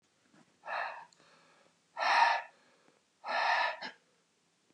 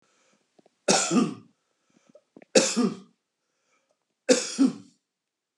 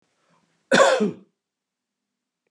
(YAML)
exhalation_length: 4.7 s
exhalation_amplitude: 6255
exhalation_signal_mean_std_ratio: 0.41
three_cough_length: 5.6 s
three_cough_amplitude: 22518
three_cough_signal_mean_std_ratio: 0.35
cough_length: 2.5 s
cough_amplitude: 26267
cough_signal_mean_std_ratio: 0.31
survey_phase: beta (2021-08-13 to 2022-03-07)
age: 45-64
gender: Male
wearing_mask: 'No'
symptom_runny_or_blocked_nose: true
smoker_status: Never smoked
respiratory_condition_asthma: false
respiratory_condition_other: false
recruitment_source: REACT
submission_delay: 6 days
covid_test_result: Negative
covid_test_method: RT-qPCR
influenza_a_test_result: Negative
influenza_b_test_result: Negative